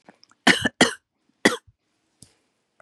{"cough_length": "2.8 s", "cough_amplitude": 32767, "cough_signal_mean_std_ratio": 0.25, "survey_phase": "beta (2021-08-13 to 2022-03-07)", "age": "65+", "gender": "Female", "wearing_mask": "No", "symptom_cough_any": true, "symptom_onset": "6 days", "smoker_status": "Never smoked", "respiratory_condition_asthma": false, "respiratory_condition_other": false, "recruitment_source": "Test and Trace", "submission_delay": "1 day", "covid_test_result": "Positive", "covid_test_method": "RT-qPCR", "covid_ct_value": 29.1, "covid_ct_gene": "N gene"}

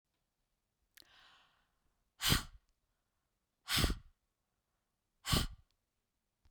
{"exhalation_length": "6.5 s", "exhalation_amplitude": 5236, "exhalation_signal_mean_std_ratio": 0.26, "survey_phase": "beta (2021-08-13 to 2022-03-07)", "age": "45-64", "gender": "Female", "wearing_mask": "Yes", "symptom_none": true, "smoker_status": "Never smoked", "respiratory_condition_asthma": false, "respiratory_condition_other": false, "recruitment_source": "REACT", "submission_delay": "2 days", "covid_test_result": "Negative", "covid_test_method": "RT-qPCR", "influenza_a_test_result": "Negative", "influenza_b_test_result": "Negative"}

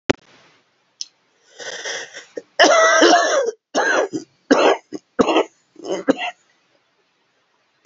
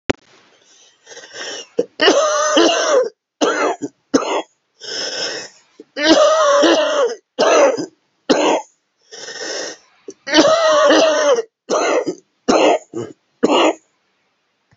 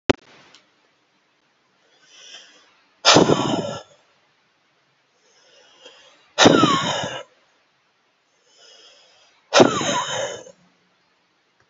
{"cough_length": "7.9 s", "cough_amplitude": 30731, "cough_signal_mean_std_ratio": 0.44, "three_cough_length": "14.8 s", "three_cough_amplitude": 32768, "three_cough_signal_mean_std_ratio": 0.6, "exhalation_length": "11.7 s", "exhalation_amplitude": 32768, "exhalation_signal_mean_std_ratio": 0.31, "survey_phase": "beta (2021-08-13 to 2022-03-07)", "age": "65+", "gender": "Male", "wearing_mask": "No", "symptom_cough_any": true, "symptom_new_continuous_cough": true, "symptom_runny_or_blocked_nose": true, "symptom_sore_throat": true, "symptom_abdominal_pain": true, "symptom_diarrhoea": true, "symptom_fatigue": true, "symptom_headache": true, "symptom_change_to_sense_of_smell_or_taste": true, "symptom_loss_of_taste": true, "symptom_onset": "6 days", "smoker_status": "Never smoked", "respiratory_condition_asthma": false, "respiratory_condition_other": false, "recruitment_source": "Test and Trace", "submission_delay": "2 days", "covid_test_result": "Positive", "covid_test_method": "RT-qPCR", "covid_ct_value": 14.5, "covid_ct_gene": "ORF1ab gene"}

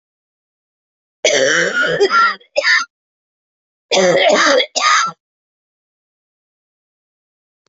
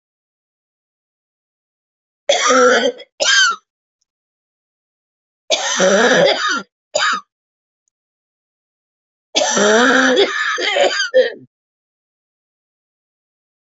{"cough_length": "7.7 s", "cough_amplitude": 30744, "cough_signal_mean_std_ratio": 0.49, "three_cough_length": "13.7 s", "three_cough_amplitude": 30269, "three_cough_signal_mean_std_ratio": 0.46, "survey_phase": "beta (2021-08-13 to 2022-03-07)", "age": "65+", "gender": "Female", "wearing_mask": "No", "symptom_cough_any": true, "symptom_shortness_of_breath": true, "symptom_fatigue": true, "symptom_fever_high_temperature": true, "symptom_change_to_sense_of_smell_or_taste": true, "symptom_loss_of_taste": true, "smoker_status": "Ex-smoker", "respiratory_condition_asthma": false, "respiratory_condition_other": false, "recruitment_source": "Test and Trace", "submission_delay": "1 day", "covid_test_result": "Positive", "covid_test_method": "RT-qPCR", "covid_ct_value": 19.6, "covid_ct_gene": "ORF1ab gene"}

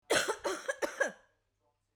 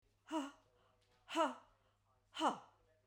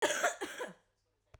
{"three_cough_length": "2.0 s", "three_cough_amplitude": 6015, "three_cough_signal_mean_std_ratio": 0.46, "exhalation_length": "3.1 s", "exhalation_amplitude": 2380, "exhalation_signal_mean_std_ratio": 0.36, "cough_length": "1.4 s", "cough_amplitude": 4992, "cough_signal_mean_std_ratio": 0.48, "survey_phase": "beta (2021-08-13 to 2022-03-07)", "age": "45-64", "gender": "Female", "wearing_mask": "No", "symptom_fatigue": true, "symptom_loss_of_taste": true, "smoker_status": "Never smoked", "respiratory_condition_asthma": false, "respiratory_condition_other": true, "recruitment_source": "REACT", "submission_delay": "1 day", "covid_test_result": "Negative", "covid_test_method": "RT-qPCR"}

